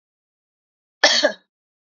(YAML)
cough_length: 1.9 s
cough_amplitude: 28314
cough_signal_mean_std_ratio: 0.29
survey_phase: beta (2021-08-13 to 2022-03-07)
age: 45-64
gender: Female
wearing_mask: 'No'
symptom_runny_or_blocked_nose: true
symptom_other: true
symptom_onset: 1 day
smoker_status: Never smoked
respiratory_condition_asthma: false
respiratory_condition_other: false
recruitment_source: Test and Trace
submission_delay: 0 days
covid_test_result: Negative
covid_test_method: RT-qPCR